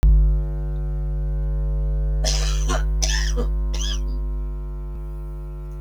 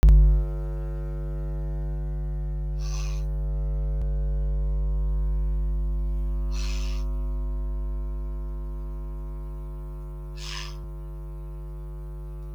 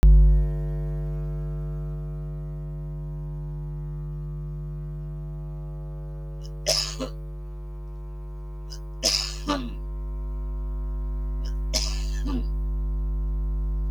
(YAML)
cough_length: 5.8 s
cough_amplitude: 17847
cough_signal_mean_std_ratio: 1.41
exhalation_length: 12.5 s
exhalation_amplitude: 10790
exhalation_signal_mean_std_ratio: 1.12
three_cough_length: 13.9 s
three_cough_amplitude: 13390
three_cough_signal_mean_std_ratio: 0.91
survey_phase: beta (2021-08-13 to 2022-03-07)
age: 65+
gender: Female
wearing_mask: 'No'
symptom_none: true
smoker_status: Ex-smoker
respiratory_condition_asthma: false
respiratory_condition_other: false
recruitment_source: REACT
submission_delay: 1 day
covid_test_result: Negative
covid_test_method: RT-qPCR